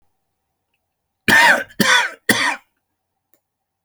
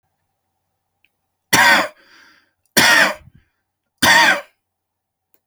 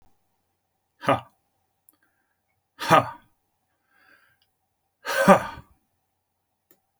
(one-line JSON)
{"cough_length": "3.8 s", "cough_amplitude": 32768, "cough_signal_mean_std_ratio": 0.38, "three_cough_length": "5.5 s", "three_cough_amplitude": 32768, "three_cough_signal_mean_std_ratio": 0.37, "exhalation_length": "7.0 s", "exhalation_amplitude": 27191, "exhalation_signal_mean_std_ratio": 0.22, "survey_phase": "alpha (2021-03-01 to 2021-08-12)", "age": "18-44", "gender": "Male", "wearing_mask": "No", "symptom_none": true, "smoker_status": "Never smoked", "respiratory_condition_asthma": false, "respiratory_condition_other": false, "recruitment_source": "REACT", "submission_delay": "1 day", "covid_test_result": "Negative", "covid_test_method": "RT-qPCR"}